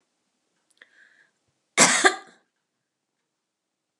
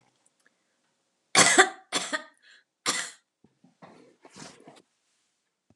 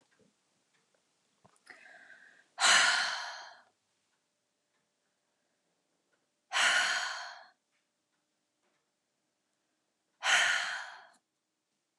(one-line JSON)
{"cough_length": "4.0 s", "cough_amplitude": 28557, "cough_signal_mean_std_ratio": 0.22, "three_cough_length": "5.8 s", "three_cough_amplitude": 27171, "three_cough_signal_mean_std_ratio": 0.25, "exhalation_length": "12.0 s", "exhalation_amplitude": 9285, "exhalation_signal_mean_std_ratio": 0.32, "survey_phase": "beta (2021-08-13 to 2022-03-07)", "age": "45-64", "gender": "Female", "wearing_mask": "No", "symptom_none": true, "symptom_onset": "12 days", "smoker_status": "Never smoked", "respiratory_condition_asthma": true, "respiratory_condition_other": false, "recruitment_source": "REACT", "submission_delay": "2 days", "covid_test_result": "Negative", "covid_test_method": "RT-qPCR", "influenza_a_test_result": "Negative", "influenza_b_test_result": "Negative"}